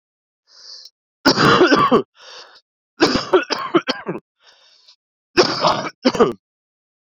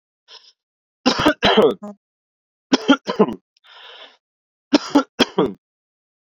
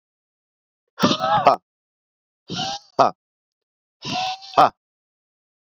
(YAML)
cough_length: 7.1 s
cough_amplitude: 32416
cough_signal_mean_std_ratio: 0.43
three_cough_length: 6.3 s
three_cough_amplitude: 32768
three_cough_signal_mean_std_ratio: 0.35
exhalation_length: 5.7 s
exhalation_amplitude: 30044
exhalation_signal_mean_std_ratio: 0.32
survey_phase: beta (2021-08-13 to 2022-03-07)
age: 18-44
gender: Male
wearing_mask: 'Yes'
symptom_headache: true
symptom_change_to_sense_of_smell_or_taste: true
symptom_onset: 6 days
smoker_status: Never smoked
respiratory_condition_asthma: false
respiratory_condition_other: false
recruitment_source: Test and Trace
submission_delay: 1 day
covid_test_result: Positive
covid_test_method: RT-qPCR